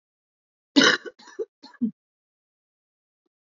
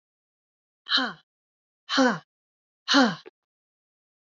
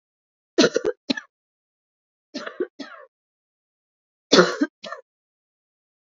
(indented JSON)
{
  "cough_length": "3.5 s",
  "cough_amplitude": 22379,
  "cough_signal_mean_std_ratio": 0.24,
  "exhalation_length": "4.4 s",
  "exhalation_amplitude": 16555,
  "exhalation_signal_mean_std_ratio": 0.32,
  "three_cough_length": "6.1 s",
  "three_cough_amplitude": 27456,
  "three_cough_signal_mean_std_ratio": 0.25,
  "survey_phase": "beta (2021-08-13 to 2022-03-07)",
  "age": "18-44",
  "gender": "Female",
  "wearing_mask": "No",
  "symptom_cough_any": true,
  "symptom_runny_or_blocked_nose": true,
  "symptom_fatigue": true,
  "symptom_other": true,
  "smoker_status": "Current smoker (e-cigarettes or vapes only)",
  "respiratory_condition_asthma": false,
  "respiratory_condition_other": false,
  "recruitment_source": "Test and Trace",
  "submission_delay": "1 day",
  "covid_test_result": "Positive",
  "covid_test_method": "RT-qPCR"
}